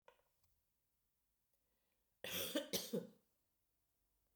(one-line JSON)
{"cough_length": "4.4 s", "cough_amplitude": 1858, "cough_signal_mean_std_ratio": 0.32, "survey_phase": "beta (2021-08-13 to 2022-03-07)", "age": "45-64", "gender": "Female", "wearing_mask": "No", "symptom_cough_any": true, "symptom_runny_or_blocked_nose": true, "symptom_sore_throat": true, "smoker_status": "Never smoked", "respiratory_condition_asthma": false, "respiratory_condition_other": false, "recruitment_source": "Test and Trace", "submission_delay": "0 days", "covid_test_result": "Positive", "covid_test_method": "LFT"}